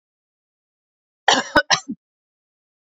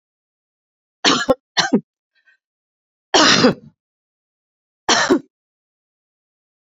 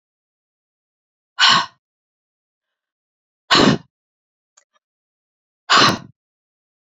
{"cough_length": "2.9 s", "cough_amplitude": 31069, "cough_signal_mean_std_ratio": 0.25, "three_cough_length": "6.7 s", "three_cough_amplitude": 32767, "three_cough_signal_mean_std_ratio": 0.32, "exhalation_length": "7.0 s", "exhalation_amplitude": 31396, "exhalation_signal_mean_std_ratio": 0.26, "survey_phase": "beta (2021-08-13 to 2022-03-07)", "age": "65+", "gender": "Female", "wearing_mask": "No", "symptom_none": true, "smoker_status": "Never smoked", "respiratory_condition_asthma": false, "respiratory_condition_other": false, "recruitment_source": "REACT", "submission_delay": "2 days", "covid_test_result": "Negative", "covid_test_method": "RT-qPCR", "influenza_a_test_result": "Unknown/Void", "influenza_b_test_result": "Unknown/Void"}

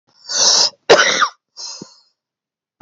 {"cough_length": "2.8 s", "cough_amplitude": 32768, "cough_signal_mean_std_ratio": 0.44, "survey_phase": "alpha (2021-03-01 to 2021-08-12)", "age": "45-64", "gender": "Male", "wearing_mask": "No", "symptom_cough_any": true, "symptom_fatigue": true, "symptom_fever_high_temperature": true, "symptom_change_to_sense_of_smell_or_taste": true, "symptom_onset": "5 days", "smoker_status": "Never smoked", "respiratory_condition_asthma": true, "respiratory_condition_other": false, "recruitment_source": "Test and Trace", "submission_delay": "2 days", "covid_test_result": "Positive", "covid_test_method": "RT-qPCR", "covid_ct_value": 24.9, "covid_ct_gene": "N gene"}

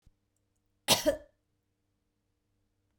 {"cough_length": "3.0 s", "cough_amplitude": 12032, "cough_signal_mean_std_ratio": 0.21, "survey_phase": "beta (2021-08-13 to 2022-03-07)", "age": "45-64", "gender": "Female", "wearing_mask": "No", "symptom_none": true, "smoker_status": "Never smoked", "respiratory_condition_asthma": false, "respiratory_condition_other": false, "recruitment_source": "Test and Trace", "submission_delay": "0 days", "covid_test_result": "Negative", "covid_test_method": "LFT"}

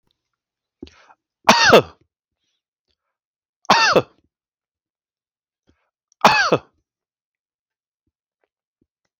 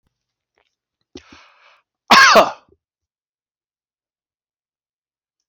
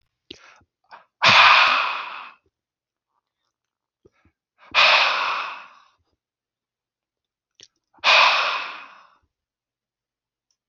{"three_cough_length": "9.2 s", "three_cough_amplitude": 32767, "three_cough_signal_mean_std_ratio": 0.25, "cough_length": "5.5 s", "cough_amplitude": 32759, "cough_signal_mean_std_ratio": 0.22, "exhalation_length": "10.7 s", "exhalation_amplitude": 28191, "exhalation_signal_mean_std_ratio": 0.35, "survey_phase": "alpha (2021-03-01 to 2021-08-12)", "age": "45-64", "gender": "Male", "wearing_mask": "No", "symptom_none": true, "smoker_status": "Ex-smoker", "respiratory_condition_asthma": false, "respiratory_condition_other": false, "recruitment_source": "REACT", "submission_delay": "1 day", "covid_test_result": "Negative", "covid_test_method": "RT-qPCR"}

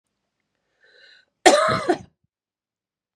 {"cough_length": "3.2 s", "cough_amplitude": 32767, "cough_signal_mean_std_ratio": 0.28, "survey_phase": "beta (2021-08-13 to 2022-03-07)", "age": "18-44", "gender": "Female", "wearing_mask": "No", "symptom_cough_any": true, "symptom_shortness_of_breath": true, "symptom_fatigue": true, "symptom_fever_high_temperature": true, "symptom_headache": true, "symptom_change_to_sense_of_smell_or_taste": true, "symptom_onset": "6 days", "smoker_status": "Current smoker (1 to 10 cigarettes per day)", "respiratory_condition_asthma": false, "respiratory_condition_other": false, "recruitment_source": "Test and Trace", "submission_delay": "2 days", "covid_test_result": "Positive", "covid_test_method": "RT-qPCR", "covid_ct_value": 20.8, "covid_ct_gene": "ORF1ab gene"}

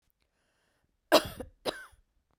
{"cough_length": "2.4 s", "cough_amplitude": 17317, "cough_signal_mean_std_ratio": 0.21, "survey_phase": "beta (2021-08-13 to 2022-03-07)", "age": "45-64", "gender": "Female", "wearing_mask": "No", "symptom_cough_any": true, "symptom_shortness_of_breath": true, "symptom_fatigue": true, "smoker_status": "Never smoked", "respiratory_condition_asthma": false, "respiratory_condition_other": false, "recruitment_source": "Test and Trace", "submission_delay": "1 day", "covid_test_result": "Positive", "covid_test_method": "RT-qPCR", "covid_ct_value": 32.0, "covid_ct_gene": "ORF1ab gene"}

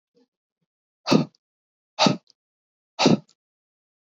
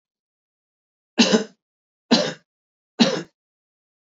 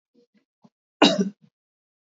{"exhalation_length": "4.1 s", "exhalation_amplitude": 23161, "exhalation_signal_mean_std_ratio": 0.26, "three_cough_length": "4.1 s", "three_cough_amplitude": 23669, "three_cough_signal_mean_std_ratio": 0.29, "cough_length": "2.0 s", "cough_amplitude": 26511, "cough_signal_mean_std_ratio": 0.25, "survey_phase": "beta (2021-08-13 to 2022-03-07)", "age": "45-64", "gender": "Male", "wearing_mask": "No", "symptom_none": true, "smoker_status": "Never smoked", "respiratory_condition_asthma": false, "respiratory_condition_other": false, "recruitment_source": "REACT", "submission_delay": "1 day", "covid_test_result": "Negative", "covid_test_method": "RT-qPCR"}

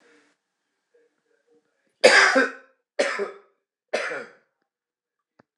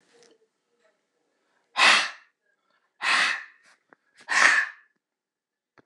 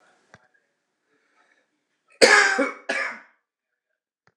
{"three_cough_length": "5.6 s", "three_cough_amplitude": 26028, "three_cough_signal_mean_std_ratio": 0.29, "exhalation_length": "5.9 s", "exhalation_amplitude": 23915, "exhalation_signal_mean_std_ratio": 0.33, "cough_length": "4.4 s", "cough_amplitude": 26028, "cough_signal_mean_std_ratio": 0.29, "survey_phase": "beta (2021-08-13 to 2022-03-07)", "age": "65+", "gender": "Male", "wearing_mask": "No", "symptom_none": true, "smoker_status": "Never smoked", "respiratory_condition_asthma": false, "respiratory_condition_other": false, "recruitment_source": "REACT", "submission_delay": "0 days", "covid_test_result": "Negative", "covid_test_method": "RT-qPCR", "influenza_a_test_result": "Negative", "influenza_b_test_result": "Negative"}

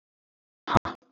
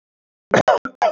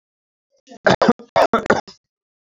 {"exhalation_length": "1.1 s", "exhalation_amplitude": 23823, "exhalation_signal_mean_std_ratio": 0.22, "cough_length": "1.1 s", "cough_amplitude": 27491, "cough_signal_mean_std_ratio": 0.43, "three_cough_length": "2.5 s", "three_cough_amplitude": 31813, "three_cough_signal_mean_std_ratio": 0.35, "survey_phase": "beta (2021-08-13 to 2022-03-07)", "age": "18-44", "gender": "Male", "wearing_mask": "No", "symptom_none": true, "smoker_status": "Never smoked", "respiratory_condition_asthma": false, "respiratory_condition_other": false, "recruitment_source": "REACT", "submission_delay": "1 day", "covid_test_result": "Negative", "covid_test_method": "RT-qPCR", "influenza_a_test_result": "Negative", "influenza_b_test_result": "Negative"}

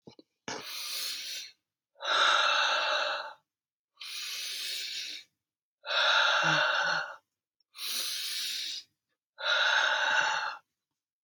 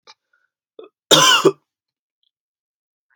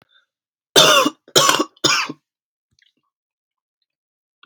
{"exhalation_length": "11.2 s", "exhalation_amplitude": 7874, "exhalation_signal_mean_std_ratio": 0.64, "cough_length": "3.2 s", "cough_amplitude": 31065, "cough_signal_mean_std_ratio": 0.28, "three_cough_length": "4.5 s", "three_cough_amplitude": 32768, "three_cough_signal_mean_std_ratio": 0.34, "survey_phase": "beta (2021-08-13 to 2022-03-07)", "age": "18-44", "gender": "Male", "wearing_mask": "No", "symptom_cough_any": true, "symptom_runny_or_blocked_nose": true, "symptom_sore_throat": true, "symptom_onset": "12 days", "smoker_status": "Never smoked", "respiratory_condition_asthma": false, "respiratory_condition_other": false, "recruitment_source": "REACT", "submission_delay": "2 days", "covid_test_result": "Negative", "covid_test_method": "RT-qPCR"}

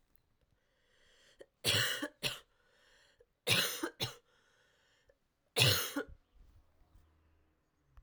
{"three_cough_length": "8.0 s", "three_cough_amplitude": 7627, "three_cough_signal_mean_std_ratio": 0.33, "survey_phase": "alpha (2021-03-01 to 2021-08-12)", "age": "18-44", "gender": "Female", "wearing_mask": "No", "symptom_cough_any": true, "symptom_new_continuous_cough": true, "symptom_shortness_of_breath": true, "symptom_diarrhoea": true, "symptom_headache": true, "symptom_onset": "4 days", "smoker_status": "Never smoked", "respiratory_condition_asthma": true, "respiratory_condition_other": false, "recruitment_source": "Test and Trace", "submission_delay": "1 day", "covid_test_result": "Positive", "covid_test_method": "RT-qPCR", "covid_ct_value": 14.9, "covid_ct_gene": "ORF1ab gene", "covid_ct_mean": 15.3, "covid_viral_load": "9700000 copies/ml", "covid_viral_load_category": "High viral load (>1M copies/ml)"}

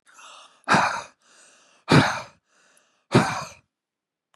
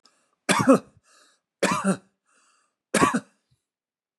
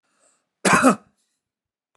{"exhalation_length": "4.4 s", "exhalation_amplitude": 24641, "exhalation_signal_mean_std_ratio": 0.34, "three_cough_length": "4.2 s", "three_cough_amplitude": 21947, "three_cough_signal_mean_std_ratio": 0.33, "cough_length": "2.0 s", "cough_amplitude": 29097, "cough_signal_mean_std_ratio": 0.31, "survey_phase": "beta (2021-08-13 to 2022-03-07)", "age": "65+", "gender": "Male", "wearing_mask": "No", "symptom_none": true, "smoker_status": "Never smoked", "respiratory_condition_asthma": true, "respiratory_condition_other": false, "recruitment_source": "REACT", "submission_delay": "1 day", "covid_test_result": "Negative", "covid_test_method": "RT-qPCR", "influenza_a_test_result": "Negative", "influenza_b_test_result": "Negative"}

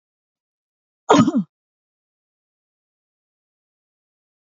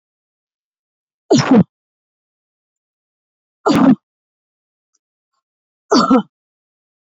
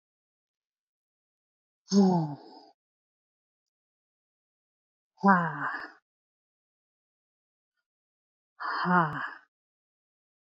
{"cough_length": "4.5 s", "cough_amplitude": 27740, "cough_signal_mean_std_ratio": 0.2, "three_cough_length": "7.2 s", "three_cough_amplitude": 29507, "three_cough_signal_mean_std_ratio": 0.29, "exhalation_length": "10.6 s", "exhalation_amplitude": 15128, "exhalation_signal_mean_std_ratio": 0.28, "survey_phase": "beta (2021-08-13 to 2022-03-07)", "age": "45-64", "gender": "Female", "wearing_mask": "No", "symptom_none": true, "smoker_status": "Never smoked", "respiratory_condition_asthma": false, "respiratory_condition_other": false, "recruitment_source": "REACT", "submission_delay": "0 days", "covid_test_result": "Negative", "covid_test_method": "RT-qPCR"}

